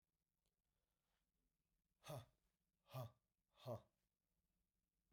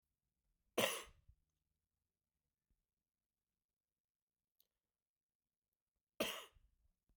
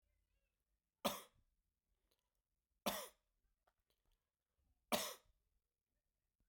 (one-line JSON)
{"exhalation_length": "5.1 s", "exhalation_amplitude": 276, "exhalation_signal_mean_std_ratio": 0.27, "cough_length": "7.2 s", "cough_amplitude": 2837, "cough_signal_mean_std_ratio": 0.18, "three_cough_length": "6.5 s", "three_cough_amplitude": 2335, "three_cough_signal_mean_std_ratio": 0.21, "survey_phase": "beta (2021-08-13 to 2022-03-07)", "age": "45-64", "gender": "Male", "wearing_mask": "No", "symptom_cough_any": true, "symptom_runny_or_blocked_nose": true, "symptom_fatigue": true, "symptom_headache": true, "symptom_change_to_sense_of_smell_or_taste": true, "symptom_loss_of_taste": true, "symptom_other": true, "symptom_onset": "2 days", "smoker_status": "Never smoked", "respiratory_condition_asthma": false, "respiratory_condition_other": false, "recruitment_source": "Test and Trace", "submission_delay": "2 days", "covid_test_result": "Positive", "covid_test_method": "RT-qPCR"}